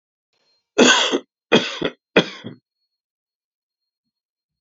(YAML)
cough_length: 4.6 s
cough_amplitude: 30198
cough_signal_mean_std_ratio: 0.3
survey_phase: alpha (2021-03-01 to 2021-08-12)
age: 45-64
gender: Male
wearing_mask: 'No'
symptom_new_continuous_cough: true
symptom_shortness_of_breath: true
symptom_headache: true
symptom_change_to_sense_of_smell_or_taste: true
symptom_loss_of_taste: true
symptom_onset: 3 days
smoker_status: Never smoked
respiratory_condition_asthma: false
respiratory_condition_other: false
recruitment_source: Test and Trace
submission_delay: 1 day
covid_test_result: Positive
covid_test_method: RT-qPCR
covid_ct_value: 18.5
covid_ct_gene: ORF1ab gene
covid_ct_mean: 19.3
covid_viral_load: 480000 copies/ml
covid_viral_load_category: Low viral load (10K-1M copies/ml)